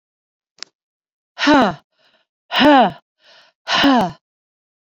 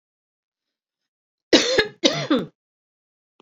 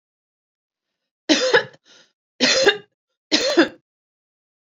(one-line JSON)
{"exhalation_length": "4.9 s", "exhalation_amplitude": 27200, "exhalation_signal_mean_std_ratio": 0.4, "cough_length": "3.4 s", "cough_amplitude": 30659, "cough_signal_mean_std_ratio": 0.32, "three_cough_length": "4.8 s", "three_cough_amplitude": 28969, "three_cough_signal_mean_std_ratio": 0.36, "survey_phase": "beta (2021-08-13 to 2022-03-07)", "age": "45-64", "gender": "Female", "wearing_mask": "No", "symptom_cough_any": true, "symptom_runny_or_blocked_nose": true, "symptom_sore_throat": true, "symptom_headache": true, "symptom_change_to_sense_of_smell_or_taste": true, "symptom_onset": "4 days", "smoker_status": "Never smoked", "respiratory_condition_asthma": false, "respiratory_condition_other": false, "recruitment_source": "Test and Trace", "submission_delay": "2 days", "covid_test_result": "Positive", "covid_test_method": "RT-qPCR"}